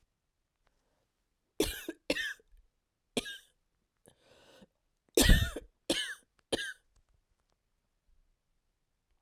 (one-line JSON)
{"cough_length": "9.2 s", "cough_amplitude": 10620, "cough_signal_mean_std_ratio": 0.24, "survey_phase": "beta (2021-08-13 to 2022-03-07)", "age": "45-64", "gender": "Female", "wearing_mask": "No", "symptom_cough_any": true, "symptom_runny_or_blocked_nose": true, "symptom_shortness_of_breath": true, "symptom_sore_throat": true, "symptom_fatigue": true, "symptom_fever_high_temperature": true, "symptom_headache": true, "symptom_onset": "3 days", "smoker_status": "Never smoked", "respiratory_condition_asthma": false, "respiratory_condition_other": false, "recruitment_source": "Test and Trace", "submission_delay": "2 days", "covid_test_result": "Positive", "covid_test_method": "RT-qPCR", "covid_ct_value": 22.7, "covid_ct_gene": "ORF1ab gene"}